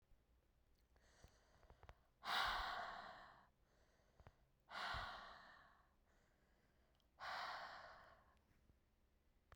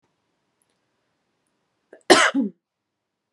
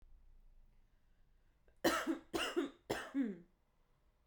{
  "exhalation_length": "9.6 s",
  "exhalation_amplitude": 1081,
  "exhalation_signal_mean_std_ratio": 0.43,
  "cough_length": "3.3 s",
  "cough_amplitude": 32648,
  "cough_signal_mean_std_ratio": 0.23,
  "three_cough_length": "4.3 s",
  "three_cough_amplitude": 3639,
  "three_cough_signal_mean_std_ratio": 0.43,
  "survey_phase": "beta (2021-08-13 to 2022-03-07)",
  "age": "18-44",
  "gender": "Female",
  "wearing_mask": "No",
  "symptom_sore_throat": true,
  "symptom_fatigue": true,
  "symptom_headache": true,
  "symptom_onset": "10 days",
  "smoker_status": "Prefer not to say",
  "respiratory_condition_asthma": false,
  "respiratory_condition_other": false,
  "recruitment_source": "REACT",
  "submission_delay": "1 day",
  "covid_test_result": "Negative",
  "covid_test_method": "RT-qPCR",
  "covid_ct_value": 38.8,
  "covid_ct_gene": "N gene",
  "influenza_a_test_result": "Negative",
  "influenza_b_test_result": "Negative"
}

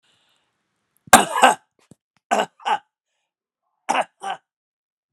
{
  "three_cough_length": "5.1 s",
  "three_cough_amplitude": 32768,
  "three_cough_signal_mean_std_ratio": 0.26,
  "survey_phase": "beta (2021-08-13 to 2022-03-07)",
  "age": "65+",
  "gender": "Male",
  "wearing_mask": "No",
  "symptom_none": true,
  "smoker_status": "Never smoked",
  "respiratory_condition_asthma": false,
  "respiratory_condition_other": false,
  "recruitment_source": "REACT",
  "submission_delay": "3 days",
  "covid_test_result": "Negative",
  "covid_test_method": "RT-qPCR"
}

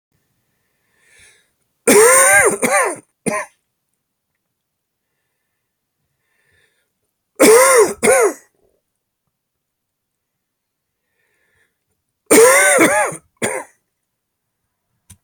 {
  "three_cough_length": "15.2 s",
  "three_cough_amplitude": 32768,
  "three_cough_signal_mean_std_ratio": 0.36,
  "survey_phase": "beta (2021-08-13 to 2022-03-07)",
  "age": "45-64",
  "gender": "Male",
  "wearing_mask": "No",
  "symptom_cough_any": true,
  "symptom_new_continuous_cough": true,
  "symptom_runny_or_blocked_nose": true,
  "symptom_sore_throat": true,
  "symptom_fatigue": true,
  "symptom_fever_high_temperature": true,
  "symptom_onset": "2 days",
  "smoker_status": "Never smoked",
  "respiratory_condition_asthma": false,
  "respiratory_condition_other": false,
  "recruitment_source": "Test and Trace",
  "submission_delay": "1 day",
  "covid_test_result": "Positive",
  "covid_test_method": "RT-qPCR",
  "covid_ct_value": 15.4,
  "covid_ct_gene": "ORF1ab gene",
  "covid_ct_mean": 15.5,
  "covid_viral_load": "8100000 copies/ml",
  "covid_viral_load_category": "High viral load (>1M copies/ml)"
}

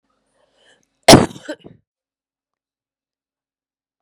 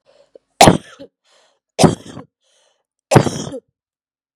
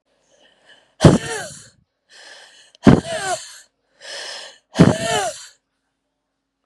{
  "cough_length": "4.0 s",
  "cough_amplitude": 32768,
  "cough_signal_mean_std_ratio": 0.17,
  "three_cough_length": "4.4 s",
  "three_cough_amplitude": 32768,
  "three_cough_signal_mean_std_ratio": 0.27,
  "exhalation_length": "6.7 s",
  "exhalation_amplitude": 32768,
  "exhalation_signal_mean_std_ratio": 0.3,
  "survey_phase": "beta (2021-08-13 to 2022-03-07)",
  "age": "45-64",
  "gender": "Female",
  "wearing_mask": "No",
  "symptom_cough_any": true,
  "symptom_runny_or_blocked_nose": true,
  "symptom_sore_throat": true,
  "symptom_abdominal_pain": true,
  "symptom_fatigue": true,
  "symptom_fever_high_temperature": true,
  "symptom_headache": true,
  "symptom_onset": "3 days",
  "smoker_status": "Ex-smoker",
  "respiratory_condition_asthma": false,
  "respiratory_condition_other": false,
  "recruitment_source": "Test and Trace",
  "submission_delay": "1 day",
  "covid_test_result": "Positive",
  "covid_test_method": "RT-qPCR",
  "covid_ct_value": 23.0,
  "covid_ct_gene": "ORF1ab gene"
}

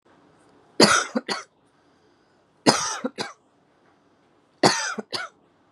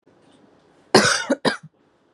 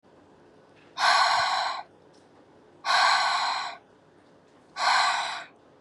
{
  "three_cough_length": "5.7 s",
  "three_cough_amplitude": 32599,
  "three_cough_signal_mean_std_ratio": 0.32,
  "cough_length": "2.1 s",
  "cough_amplitude": 32038,
  "cough_signal_mean_std_ratio": 0.35,
  "exhalation_length": "5.8 s",
  "exhalation_amplitude": 11897,
  "exhalation_signal_mean_std_ratio": 0.56,
  "survey_phase": "beta (2021-08-13 to 2022-03-07)",
  "age": "18-44",
  "gender": "Female",
  "wearing_mask": "No",
  "symptom_none": true,
  "smoker_status": "Never smoked",
  "respiratory_condition_asthma": false,
  "respiratory_condition_other": false,
  "recruitment_source": "REACT",
  "submission_delay": "2 days",
  "covid_test_result": "Negative",
  "covid_test_method": "RT-qPCR",
  "influenza_a_test_result": "Negative",
  "influenza_b_test_result": "Negative"
}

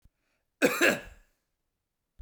{
  "cough_length": "2.2 s",
  "cough_amplitude": 13264,
  "cough_signal_mean_std_ratio": 0.3,
  "survey_phase": "beta (2021-08-13 to 2022-03-07)",
  "age": "45-64",
  "gender": "Male",
  "wearing_mask": "No",
  "symptom_none": true,
  "smoker_status": "Never smoked",
  "respiratory_condition_asthma": false,
  "respiratory_condition_other": false,
  "recruitment_source": "REACT",
  "submission_delay": "2 days",
  "covid_test_result": "Negative",
  "covid_test_method": "RT-qPCR"
}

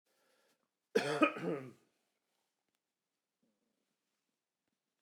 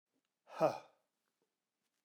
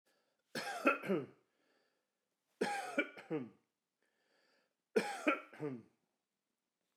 {
  "cough_length": "5.0 s",
  "cough_amplitude": 6530,
  "cough_signal_mean_std_ratio": 0.24,
  "exhalation_length": "2.0 s",
  "exhalation_amplitude": 3471,
  "exhalation_signal_mean_std_ratio": 0.22,
  "three_cough_length": "7.0 s",
  "three_cough_amplitude": 4315,
  "three_cough_signal_mean_std_ratio": 0.36,
  "survey_phase": "alpha (2021-03-01 to 2021-08-12)",
  "age": "45-64",
  "gender": "Male",
  "wearing_mask": "No",
  "symptom_cough_any": true,
  "symptom_fatigue": true,
  "symptom_onset": "12 days",
  "smoker_status": "Ex-smoker",
  "respiratory_condition_asthma": false,
  "respiratory_condition_other": false,
  "recruitment_source": "REACT",
  "submission_delay": "2 days",
  "covid_test_result": "Negative",
  "covid_test_method": "RT-qPCR"
}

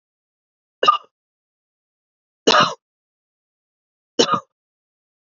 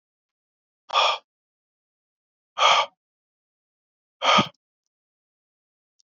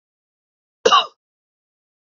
{
  "three_cough_length": "5.4 s",
  "three_cough_amplitude": 29492,
  "three_cough_signal_mean_std_ratio": 0.24,
  "exhalation_length": "6.1 s",
  "exhalation_amplitude": 19253,
  "exhalation_signal_mean_std_ratio": 0.27,
  "cough_length": "2.1 s",
  "cough_amplitude": 28512,
  "cough_signal_mean_std_ratio": 0.22,
  "survey_phase": "beta (2021-08-13 to 2022-03-07)",
  "age": "18-44",
  "gender": "Male",
  "wearing_mask": "No",
  "symptom_none": true,
  "smoker_status": "Current smoker (e-cigarettes or vapes only)",
  "respiratory_condition_asthma": false,
  "respiratory_condition_other": false,
  "recruitment_source": "REACT",
  "submission_delay": "1 day",
  "covid_test_result": "Negative",
  "covid_test_method": "RT-qPCR"
}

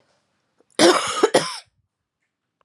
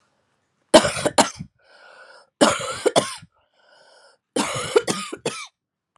{
  "cough_length": "2.6 s",
  "cough_amplitude": 28697,
  "cough_signal_mean_std_ratio": 0.35,
  "three_cough_length": "6.0 s",
  "three_cough_amplitude": 32767,
  "three_cough_signal_mean_std_ratio": 0.35,
  "survey_phase": "alpha (2021-03-01 to 2021-08-12)",
  "age": "18-44",
  "gender": "Female",
  "wearing_mask": "No",
  "symptom_shortness_of_breath": true,
  "symptom_abdominal_pain": true,
  "symptom_diarrhoea": true,
  "symptom_fatigue": true,
  "symptom_fever_high_temperature": true,
  "symptom_headache": true,
  "symptom_change_to_sense_of_smell_or_taste": true,
  "symptom_loss_of_taste": true,
  "symptom_onset": "4 days",
  "smoker_status": "Current smoker (11 or more cigarettes per day)",
  "respiratory_condition_asthma": false,
  "respiratory_condition_other": false,
  "recruitment_source": "Test and Trace",
  "submission_delay": "2 days",
  "covid_test_result": "Positive",
  "covid_test_method": "RT-qPCR",
  "covid_ct_value": 16.1,
  "covid_ct_gene": "ORF1ab gene",
  "covid_ct_mean": 16.1,
  "covid_viral_load": "5200000 copies/ml",
  "covid_viral_load_category": "High viral load (>1M copies/ml)"
}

